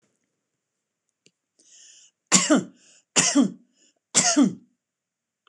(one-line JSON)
{"three_cough_length": "5.5 s", "three_cough_amplitude": 26028, "three_cough_signal_mean_std_ratio": 0.34, "survey_phase": "beta (2021-08-13 to 2022-03-07)", "age": "45-64", "gender": "Female", "wearing_mask": "No", "symptom_none": true, "smoker_status": "Ex-smoker", "respiratory_condition_asthma": false, "respiratory_condition_other": false, "recruitment_source": "REACT", "submission_delay": "2 days", "covid_test_result": "Negative", "covid_test_method": "RT-qPCR", "influenza_a_test_result": "Negative", "influenza_b_test_result": "Negative"}